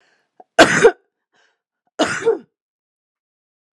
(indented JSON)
{
  "cough_length": "3.8 s",
  "cough_amplitude": 32768,
  "cough_signal_mean_std_ratio": 0.28,
  "survey_phase": "alpha (2021-03-01 to 2021-08-12)",
  "age": "45-64",
  "gender": "Female",
  "wearing_mask": "No",
  "symptom_none": true,
  "smoker_status": "Never smoked",
  "respiratory_condition_asthma": false,
  "respiratory_condition_other": false,
  "recruitment_source": "REACT",
  "submission_delay": "18 days",
  "covid_test_result": "Negative",
  "covid_test_method": "RT-qPCR"
}